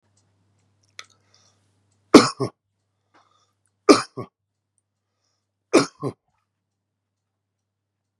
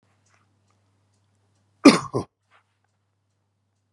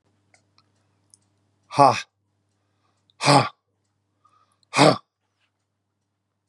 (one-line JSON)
{"three_cough_length": "8.2 s", "three_cough_amplitude": 32768, "three_cough_signal_mean_std_ratio": 0.16, "cough_length": "3.9 s", "cough_amplitude": 32767, "cough_signal_mean_std_ratio": 0.15, "exhalation_length": "6.5 s", "exhalation_amplitude": 28676, "exhalation_signal_mean_std_ratio": 0.23, "survey_phase": "beta (2021-08-13 to 2022-03-07)", "age": "65+", "gender": "Male", "wearing_mask": "No", "symptom_none": true, "smoker_status": "Ex-smoker", "respiratory_condition_asthma": false, "respiratory_condition_other": false, "recruitment_source": "REACT", "submission_delay": "6 days", "covid_test_result": "Negative", "covid_test_method": "RT-qPCR", "influenza_a_test_result": "Negative", "influenza_b_test_result": "Negative"}